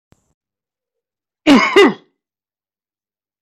{
  "cough_length": "3.4 s",
  "cough_amplitude": 27688,
  "cough_signal_mean_std_ratio": 0.29,
  "survey_phase": "alpha (2021-03-01 to 2021-08-12)",
  "age": "45-64",
  "gender": "Male",
  "wearing_mask": "No",
  "symptom_shortness_of_breath": true,
  "symptom_fatigue": true,
  "symptom_headache": true,
  "smoker_status": "Never smoked",
  "respiratory_condition_asthma": true,
  "respiratory_condition_other": false,
  "recruitment_source": "REACT",
  "submission_delay": "2 days",
  "covid_test_result": "Negative",
  "covid_test_method": "RT-qPCR"
}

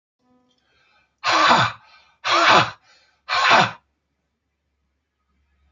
{
  "exhalation_length": "5.7 s",
  "exhalation_amplitude": 28436,
  "exhalation_signal_mean_std_ratio": 0.39,
  "survey_phase": "alpha (2021-03-01 to 2021-08-12)",
  "age": "45-64",
  "gender": "Male",
  "wearing_mask": "No",
  "symptom_none": true,
  "smoker_status": "Ex-smoker",
  "respiratory_condition_asthma": false,
  "respiratory_condition_other": false,
  "recruitment_source": "REACT",
  "submission_delay": "1 day",
  "covid_test_result": "Negative",
  "covid_test_method": "RT-qPCR"
}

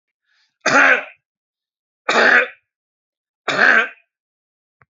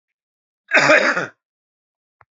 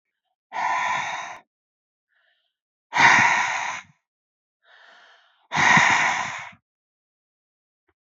{
  "three_cough_length": "4.9 s",
  "three_cough_amplitude": 30865,
  "three_cough_signal_mean_std_ratio": 0.38,
  "cough_length": "2.3 s",
  "cough_amplitude": 29942,
  "cough_signal_mean_std_ratio": 0.36,
  "exhalation_length": "8.0 s",
  "exhalation_amplitude": 24983,
  "exhalation_signal_mean_std_ratio": 0.41,
  "survey_phase": "beta (2021-08-13 to 2022-03-07)",
  "age": "45-64",
  "gender": "Male",
  "wearing_mask": "No",
  "symptom_cough_any": true,
  "symptom_sore_throat": true,
  "smoker_status": "Never smoked",
  "respiratory_condition_asthma": false,
  "respiratory_condition_other": false,
  "recruitment_source": "Test and Trace",
  "submission_delay": "1 day",
  "covid_test_result": "Positive",
  "covid_test_method": "RT-qPCR",
  "covid_ct_value": 20.8,
  "covid_ct_gene": "ORF1ab gene",
  "covid_ct_mean": 21.0,
  "covid_viral_load": "130000 copies/ml",
  "covid_viral_load_category": "Low viral load (10K-1M copies/ml)"
}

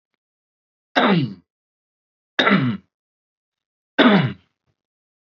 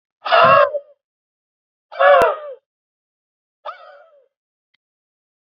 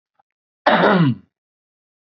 {
  "three_cough_length": "5.4 s",
  "three_cough_amplitude": 27278,
  "three_cough_signal_mean_std_ratio": 0.35,
  "exhalation_length": "5.5 s",
  "exhalation_amplitude": 31014,
  "exhalation_signal_mean_std_ratio": 0.33,
  "cough_length": "2.1 s",
  "cough_amplitude": 27898,
  "cough_signal_mean_std_ratio": 0.4,
  "survey_phase": "beta (2021-08-13 to 2022-03-07)",
  "age": "45-64",
  "gender": "Male",
  "wearing_mask": "No",
  "symptom_cough_any": true,
  "symptom_diarrhoea": true,
  "symptom_headache": true,
  "smoker_status": "Ex-smoker",
  "respiratory_condition_asthma": false,
  "respiratory_condition_other": false,
  "recruitment_source": "REACT",
  "submission_delay": "2 days",
  "covid_test_result": "Negative",
  "covid_test_method": "RT-qPCR",
  "influenza_a_test_result": "Negative",
  "influenza_b_test_result": "Negative"
}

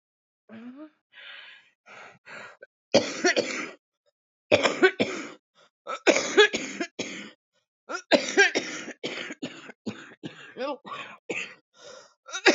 {
  "three_cough_length": "12.5 s",
  "three_cough_amplitude": 21349,
  "three_cough_signal_mean_std_ratio": 0.37,
  "survey_phase": "beta (2021-08-13 to 2022-03-07)",
  "age": "18-44",
  "gender": "Female",
  "wearing_mask": "No",
  "symptom_new_continuous_cough": true,
  "symptom_runny_or_blocked_nose": true,
  "symptom_shortness_of_breath": true,
  "symptom_sore_throat": true,
  "symptom_fatigue": true,
  "symptom_onset": "8 days",
  "smoker_status": "Current smoker (1 to 10 cigarettes per day)",
  "respiratory_condition_asthma": true,
  "respiratory_condition_other": false,
  "recruitment_source": "REACT",
  "submission_delay": "2 days",
  "covid_test_result": "Negative",
  "covid_test_method": "RT-qPCR",
  "influenza_a_test_result": "Negative",
  "influenza_b_test_result": "Negative"
}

